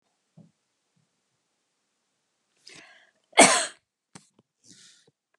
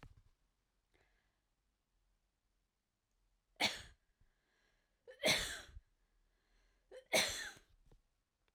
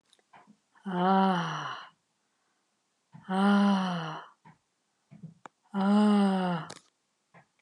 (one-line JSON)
{"cough_length": "5.4 s", "cough_amplitude": 30662, "cough_signal_mean_std_ratio": 0.17, "three_cough_length": "8.5 s", "three_cough_amplitude": 3365, "three_cough_signal_mean_std_ratio": 0.25, "exhalation_length": "7.6 s", "exhalation_amplitude": 7539, "exhalation_signal_mean_std_ratio": 0.52, "survey_phase": "alpha (2021-03-01 to 2021-08-12)", "age": "65+", "gender": "Female", "wearing_mask": "No", "symptom_none": true, "smoker_status": "Never smoked", "respiratory_condition_asthma": false, "respiratory_condition_other": false, "recruitment_source": "REACT", "submission_delay": "1 day", "covid_test_result": "Negative", "covid_test_method": "RT-qPCR"}